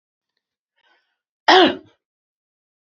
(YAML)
cough_length: 2.8 s
cough_amplitude: 28402
cough_signal_mean_std_ratio: 0.24
survey_phase: beta (2021-08-13 to 2022-03-07)
age: 45-64
gender: Female
wearing_mask: 'No'
symptom_none: true
smoker_status: Ex-smoker
respiratory_condition_asthma: false
respiratory_condition_other: false
recruitment_source: REACT
submission_delay: 2 days
covid_test_result: Negative
covid_test_method: RT-qPCR
influenza_a_test_result: Negative
influenza_b_test_result: Negative